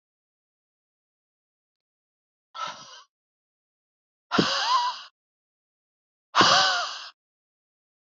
exhalation_length: 8.2 s
exhalation_amplitude: 20226
exhalation_signal_mean_std_ratio: 0.31
survey_phase: beta (2021-08-13 to 2022-03-07)
age: 45-64
gender: Female
wearing_mask: 'No'
symptom_none: true
smoker_status: Never smoked
respiratory_condition_asthma: false
respiratory_condition_other: false
recruitment_source: REACT
submission_delay: 0 days
covid_test_result: Negative
covid_test_method: RT-qPCR
influenza_a_test_result: Negative
influenza_b_test_result: Negative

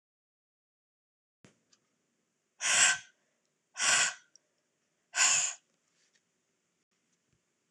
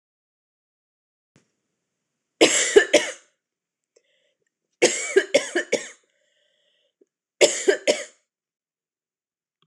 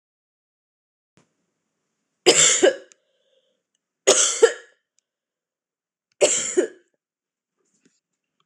exhalation_length: 7.7 s
exhalation_amplitude: 9145
exhalation_signal_mean_std_ratio: 0.29
cough_length: 9.7 s
cough_amplitude: 26028
cough_signal_mean_std_ratio: 0.28
three_cough_length: 8.5 s
three_cough_amplitude: 26028
three_cough_signal_mean_std_ratio: 0.28
survey_phase: alpha (2021-03-01 to 2021-08-12)
age: 18-44
gender: Female
wearing_mask: 'No'
symptom_cough_any: true
symptom_new_continuous_cough: true
symptom_fatigue: true
symptom_headache: true
symptom_change_to_sense_of_smell_or_taste: true
symptom_loss_of_taste: true
smoker_status: Never smoked
respiratory_condition_asthma: false
respiratory_condition_other: false
recruitment_source: Test and Trace
submission_delay: 1 day
covid_test_result: Positive
covid_test_method: RT-qPCR
covid_ct_value: 13.7
covid_ct_gene: ORF1ab gene
covid_ct_mean: 13.9
covid_viral_load: 28000000 copies/ml
covid_viral_load_category: High viral load (>1M copies/ml)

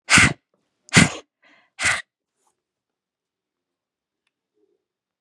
exhalation_length: 5.2 s
exhalation_amplitude: 32646
exhalation_signal_mean_std_ratio: 0.24
survey_phase: beta (2021-08-13 to 2022-03-07)
age: 18-44
gender: Female
wearing_mask: 'No'
symptom_none: true
smoker_status: Never smoked
respiratory_condition_asthma: false
respiratory_condition_other: false
recruitment_source: Test and Trace
submission_delay: 1 day
covid_test_result: Negative
covid_test_method: ePCR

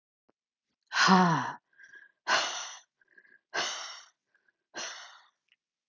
exhalation_length: 5.9 s
exhalation_amplitude: 12418
exhalation_signal_mean_std_ratio: 0.36
survey_phase: alpha (2021-03-01 to 2021-08-12)
age: 45-64
gender: Female
wearing_mask: 'No'
symptom_cough_any: true
symptom_fatigue: true
smoker_status: Never smoked
respiratory_condition_asthma: false
respiratory_condition_other: false
recruitment_source: REACT
submission_delay: 2 days
covid_test_result: Negative
covid_test_method: RT-qPCR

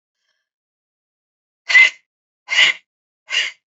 exhalation_length: 3.8 s
exhalation_amplitude: 28570
exhalation_signal_mean_std_ratio: 0.3
survey_phase: beta (2021-08-13 to 2022-03-07)
age: 18-44
gender: Female
wearing_mask: 'No'
symptom_shortness_of_breath: true
symptom_sore_throat: true
symptom_abdominal_pain: true
symptom_diarrhoea: true
symptom_fatigue: true
symptom_headache: true
smoker_status: Never smoked
respiratory_condition_asthma: true
respiratory_condition_other: false
recruitment_source: REACT
submission_delay: 2 days
covid_test_result: Negative
covid_test_method: RT-qPCR
influenza_a_test_result: Negative
influenza_b_test_result: Negative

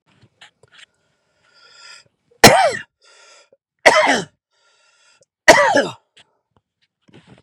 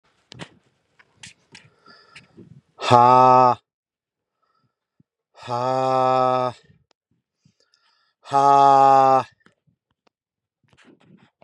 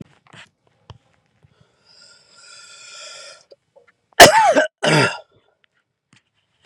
three_cough_length: 7.4 s
three_cough_amplitude: 32768
three_cough_signal_mean_std_ratio: 0.29
exhalation_length: 11.4 s
exhalation_amplitude: 32713
exhalation_signal_mean_std_ratio: 0.36
cough_length: 6.7 s
cough_amplitude: 32768
cough_signal_mean_std_ratio: 0.26
survey_phase: beta (2021-08-13 to 2022-03-07)
age: 18-44
gender: Male
wearing_mask: 'No'
symptom_none: true
smoker_status: Never smoked
respiratory_condition_asthma: false
respiratory_condition_other: false
recruitment_source: REACT
submission_delay: 4 days
covid_test_result: Negative
covid_test_method: RT-qPCR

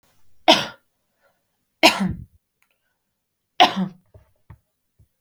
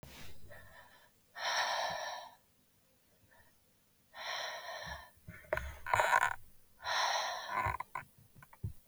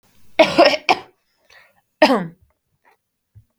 three_cough_length: 5.2 s
three_cough_amplitude: 32768
three_cough_signal_mean_std_ratio: 0.26
exhalation_length: 8.9 s
exhalation_amplitude: 7476
exhalation_signal_mean_std_ratio: 0.52
cough_length: 3.6 s
cough_amplitude: 32768
cough_signal_mean_std_ratio: 0.32
survey_phase: beta (2021-08-13 to 2022-03-07)
age: 18-44
gender: Female
wearing_mask: 'No'
symptom_cough_any: true
symptom_runny_or_blocked_nose: true
smoker_status: Never smoked
respiratory_condition_asthma: false
respiratory_condition_other: false
recruitment_source: REACT
submission_delay: 1 day
covid_test_result: Negative
covid_test_method: RT-qPCR
influenza_a_test_result: Negative
influenza_b_test_result: Negative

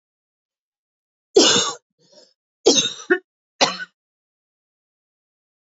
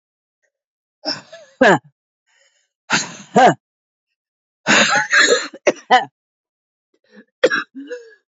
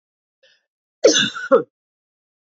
three_cough_length: 5.6 s
three_cough_amplitude: 29691
three_cough_signal_mean_std_ratio: 0.29
exhalation_length: 8.4 s
exhalation_amplitude: 31663
exhalation_signal_mean_std_ratio: 0.36
cough_length: 2.6 s
cough_amplitude: 27040
cough_signal_mean_std_ratio: 0.3
survey_phase: beta (2021-08-13 to 2022-03-07)
age: 45-64
gender: Female
wearing_mask: 'No'
symptom_cough_any: true
symptom_runny_or_blocked_nose: true
symptom_sore_throat: true
symptom_fatigue: true
symptom_headache: true
symptom_onset: 3 days
smoker_status: Never smoked
respiratory_condition_asthma: true
respiratory_condition_other: false
recruitment_source: Test and Trace
submission_delay: 1 day
covid_test_result: Positive
covid_test_method: ePCR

